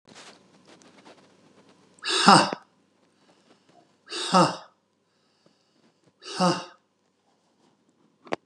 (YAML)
exhalation_length: 8.5 s
exhalation_amplitude: 31547
exhalation_signal_mean_std_ratio: 0.26
survey_phase: beta (2021-08-13 to 2022-03-07)
age: 65+
gender: Male
wearing_mask: 'No'
symptom_none: true
smoker_status: Never smoked
respiratory_condition_asthma: false
respiratory_condition_other: false
recruitment_source: REACT
submission_delay: 1 day
covid_test_result: Negative
covid_test_method: RT-qPCR
influenza_a_test_result: Negative
influenza_b_test_result: Negative